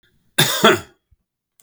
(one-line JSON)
{"cough_length": "1.6 s", "cough_amplitude": 32768, "cough_signal_mean_std_ratio": 0.36, "survey_phase": "beta (2021-08-13 to 2022-03-07)", "age": "65+", "gender": "Male", "wearing_mask": "No", "symptom_none": true, "smoker_status": "Never smoked", "respiratory_condition_asthma": false, "respiratory_condition_other": false, "recruitment_source": "REACT", "submission_delay": "2 days", "covid_test_result": "Negative", "covid_test_method": "RT-qPCR", "influenza_a_test_result": "Negative", "influenza_b_test_result": "Negative"}